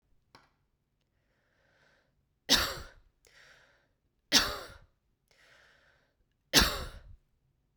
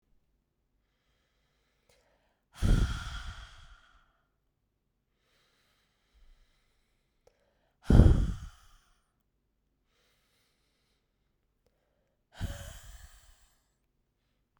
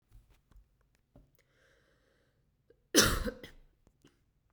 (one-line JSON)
{"three_cough_length": "7.8 s", "three_cough_amplitude": 16072, "three_cough_signal_mean_std_ratio": 0.24, "exhalation_length": "14.6 s", "exhalation_amplitude": 23579, "exhalation_signal_mean_std_ratio": 0.2, "cough_length": "4.5 s", "cough_amplitude": 12761, "cough_signal_mean_std_ratio": 0.22, "survey_phase": "beta (2021-08-13 to 2022-03-07)", "age": "18-44", "gender": "Female", "wearing_mask": "No", "symptom_cough_any": true, "symptom_runny_or_blocked_nose": true, "symptom_fatigue": true, "symptom_headache": true, "symptom_onset": "5 days", "smoker_status": "Never smoked", "respiratory_condition_asthma": true, "respiratory_condition_other": false, "recruitment_source": "REACT", "submission_delay": "1 day", "covid_test_result": "Negative", "covid_test_method": "RT-qPCR", "influenza_a_test_result": "Negative", "influenza_b_test_result": "Negative"}